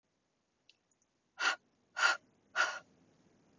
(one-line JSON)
{"exhalation_length": "3.6 s", "exhalation_amplitude": 5970, "exhalation_signal_mean_std_ratio": 0.31, "survey_phase": "beta (2021-08-13 to 2022-03-07)", "age": "18-44", "gender": "Female", "wearing_mask": "No", "symptom_none": true, "smoker_status": "Never smoked", "respiratory_condition_asthma": false, "respiratory_condition_other": false, "recruitment_source": "REACT", "submission_delay": "2 days", "covid_test_result": "Negative", "covid_test_method": "RT-qPCR", "influenza_a_test_result": "Negative", "influenza_b_test_result": "Negative"}